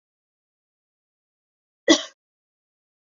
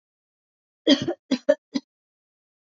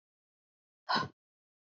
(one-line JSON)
{"cough_length": "3.1 s", "cough_amplitude": 27332, "cough_signal_mean_std_ratio": 0.14, "three_cough_length": "2.6 s", "three_cough_amplitude": 22573, "three_cough_signal_mean_std_ratio": 0.27, "exhalation_length": "1.8 s", "exhalation_amplitude": 3857, "exhalation_signal_mean_std_ratio": 0.25, "survey_phase": "beta (2021-08-13 to 2022-03-07)", "age": "18-44", "gender": "Female", "wearing_mask": "No", "symptom_none": true, "symptom_onset": "12 days", "smoker_status": "Current smoker (1 to 10 cigarettes per day)", "respiratory_condition_asthma": false, "respiratory_condition_other": false, "recruitment_source": "REACT", "submission_delay": "2 days", "covid_test_result": "Negative", "covid_test_method": "RT-qPCR", "influenza_a_test_result": "Negative", "influenza_b_test_result": "Negative"}